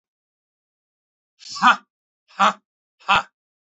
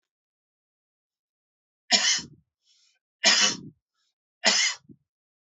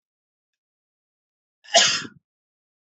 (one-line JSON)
{"exhalation_length": "3.7 s", "exhalation_amplitude": 29348, "exhalation_signal_mean_std_ratio": 0.25, "three_cough_length": "5.5 s", "three_cough_amplitude": 20338, "three_cough_signal_mean_std_ratio": 0.32, "cough_length": "2.8 s", "cough_amplitude": 25777, "cough_signal_mean_std_ratio": 0.24, "survey_phase": "alpha (2021-03-01 to 2021-08-12)", "age": "45-64", "gender": "Male", "wearing_mask": "No", "symptom_none": true, "smoker_status": "Never smoked", "respiratory_condition_asthma": true, "respiratory_condition_other": false, "recruitment_source": "Test and Trace", "submission_delay": "2 days", "covid_test_result": "Positive", "covid_test_method": "RT-qPCR", "covid_ct_value": 18.4, "covid_ct_gene": "ORF1ab gene", "covid_ct_mean": 19.1, "covid_viral_load": "550000 copies/ml", "covid_viral_load_category": "Low viral load (10K-1M copies/ml)"}